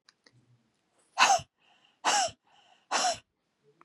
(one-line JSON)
{"exhalation_length": "3.8 s", "exhalation_amplitude": 13494, "exhalation_signal_mean_std_ratio": 0.34, "survey_phase": "beta (2021-08-13 to 2022-03-07)", "age": "45-64", "gender": "Female", "wearing_mask": "No", "symptom_sore_throat": true, "symptom_onset": "6 days", "smoker_status": "Ex-smoker", "respiratory_condition_asthma": false, "respiratory_condition_other": false, "recruitment_source": "Test and Trace", "submission_delay": "2 days", "covid_test_result": "Negative", "covid_test_method": "RT-qPCR"}